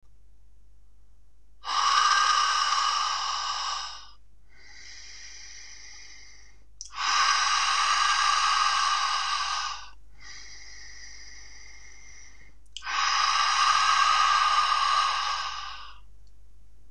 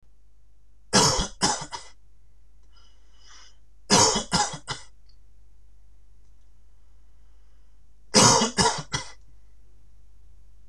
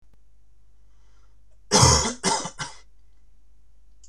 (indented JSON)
{
  "exhalation_length": "16.9 s",
  "exhalation_amplitude": 12865,
  "exhalation_signal_mean_std_ratio": 0.76,
  "three_cough_length": "10.7 s",
  "three_cough_amplitude": 25980,
  "three_cough_signal_mean_std_ratio": 0.46,
  "cough_length": "4.1 s",
  "cough_amplitude": 23625,
  "cough_signal_mean_std_ratio": 0.41,
  "survey_phase": "beta (2021-08-13 to 2022-03-07)",
  "age": "18-44",
  "gender": "Male",
  "wearing_mask": "No",
  "symptom_none": true,
  "smoker_status": "Never smoked",
  "respiratory_condition_asthma": false,
  "respiratory_condition_other": false,
  "recruitment_source": "REACT",
  "submission_delay": "5 days",
  "covid_test_result": "Negative",
  "covid_test_method": "RT-qPCR",
  "influenza_a_test_result": "Negative",
  "influenza_b_test_result": "Negative"
}